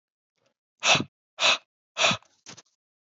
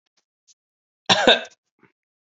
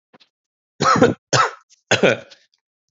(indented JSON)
{
  "exhalation_length": "3.2 s",
  "exhalation_amplitude": 16541,
  "exhalation_signal_mean_std_ratio": 0.33,
  "cough_length": "2.3 s",
  "cough_amplitude": 28842,
  "cough_signal_mean_std_ratio": 0.26,
  "three_cough_length": "2.9 s",
  "three_cough_amplitude": 32767,
  "three_cough_signal_mean_std_ratio": 0.4,
  "survey_phase": "alpha (2021-03-01 to 2021-08-12)",
  "age": "18-44",
  "gender": "Male",
  "wearing_mask": "No",
  "symptom_cough_any": true,
  "symptom_fatigue": true,
  "symptom_fever_high_temperature": true,
  "symptom_headache": true,
  "symptom_change_to_sense_of_smell_or_taste": true,
  "symptom_loss_of_taste": true,
  "symptom_onset": "5 days",
  "smoker_status": "Never smoked",
  "respiratory_condition_asthma": false,
  "respiratory_condition_other": false,
  "recruitment_source": "Test and Trace",
  "submission_delay": "2 days",
  "covid_test_result": "Positive",
  "covid_test_method": "RT-qPCR",
  "covid_ct_value": 17.6,
  "covid_ct_gene": "ORF1ab gene",
  "covid_ct_mean": 18.0,
  "covid_viral_load": "1300000 copies/ml",
  "covid_viral_load_category": "High viral load (>1M copies/ml)"
}